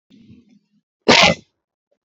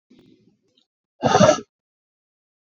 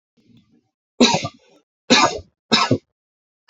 {"cough_length": "2.1 s", "cough_amplitude": 32490, "cough_signal_mean_std_ratio": 0.28, "exhalation_length": "2.6 s", "exhalation_amplitude": 27372, "exhalation_signal_mean_std_ratio": 0.27, "three_cough_length": "3.5 s", "three_cough_amplitude": 32392, "three_cough_signal_mean_std_ratio": 0.35, "survey_phase": "beta (2021-08-13 to 2022-03-07)", "age": "18-44", "gender": "Male", "wearing_mask": "No", "symptom_none": true, "smoker_status": "Ex-smoker", "respiratory_condition_asthma": false, "respiratory_condition_other": false, "recruitment_source": "Test and Trace", "submission_delay": "1 day", "covid_test_result": "Negative", "covid_test_method": "LFT"}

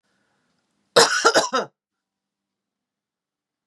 {"cough_length": "3.7 s", "cough_amplitude": 32312, "cough_signal_mean_std_ratio": 0.28, "survey_phase": "beta (2021-08-13 to 2022-03-07)", "age": "45-64", "gender": "Female", "wearing_mask": "No", "symptom_runny_or_blocked_nose": true, "smoker_status": "Ex-smoker", "respiratory_condition_asthma": false, "respiratory_condition_other": false, "recruitment_source": "Test and Trace", "submission_delay": "1 day", "covid_test_result": "Positive", "covid_test_method": "ePCR"}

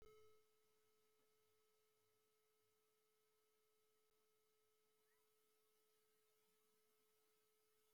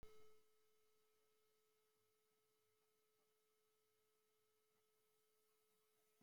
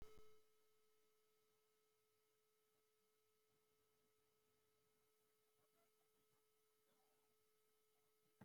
{"three_cough_length": "7.9 s", "three_cough_amplitude": 49, "three_cough_signal_mean_std_ratio": 0.73, "cough_length": "6.2 s", "cough_amplitude": 106, "cough_signal_mean_std_ratio": 0.45, "exhalation_length": "8.4 s", "exhalation_amplitude": 125, "exhalation_signal_mean_std_ratio": 0.43, "survey_phase": "beta (2021-08-13 to 2022-03-07)", "age": "65+", "gender": "Male", "wearing_mask": "No", "symptom_none": true, "smoker_status": "Never smoked", "respiratory_condition_asthma": false, "respiratory_condition_other": false, "recruitment_source": "REACT", "submission_delay": "3 days", "covid_test_result": "Negative", "covid_test_method": "RT-qPCR", "influenza_a_test_result": "Negative", "influenza_b_test_result": "Negative"}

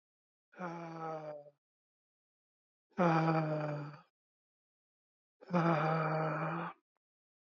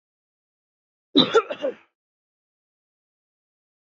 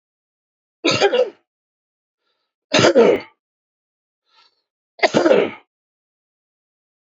{"exhalation_length": "7.4 s", "exhalation_amplitude": 4483, "exhalation_signal_mean_std_ratio": 0.49, "cough_length": "3.9 s", "cough_amplitude": 24591, "cough_signal_mean_std_ratio": 0.22, "three_cough_length": "7.1 s", "three_cough_amplitude": 28987, "three_cough_signal_mean_std_ratio": 0.33, "survey_phase": "alpha (2021-03-01 to 2021-08-12)", "age": "18-44", "gender": "Male", "wearing_mask": "No", "symptom_cough_any": true, "symptom_headache": true, "smoker_status": "Never smoked", "respiratory_condition_asthma": false, "respiratory_condition_other": true, "recruitment_source": "Test and Trace", "submission_delay": "1 day", "covid_test_result": "Positive", "covid_test_method": "RT-qPCR", "covid_ct_value": 22.5, "covid_ct_gene": "ORF1ab gene", "covid_ct_mean": 23.2, "covid_viral_load": "25000 copies/ml", "covid_viral_load_category": "Low viral load (10K-1M copies/ml)"}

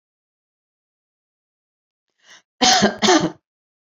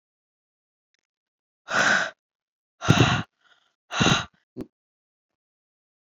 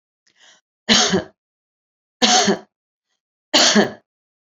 {"cough_length": "3.9 s", "cough_amplitude": 28441, "cough_signal_mean_std_ratio": 0.3, "exhalation_length": "6.1 s", "exhalation_amplitude": 25897, "exhalation_signal_mean_std_ratio": 0.32, "three_cough_length": "4.4 s", "three_cough_amplitude": 29716, "three_cough_signal_mean_std_ratio": 0.39, "survey_phase": "beta (2021-08-13 to 2022-03-07)", "age": "45-64", "gender": "Female", "wearing_mask": "Yes", "symptom_none": true, "smoker_status": "Current smoker (1 to 10 cigarettes per day)", "respiratory_condition_asthma": false, "respiratory_condition_other": false, "recruitment_source": "REACT", "submission_delay": "1 day", "covid_test_result": "Negative", "covid_test_method": "RT-qPCR", "influenza_a_test_result": "Unknown/Void", "influenza_b_test_result": "Unknown/Void"}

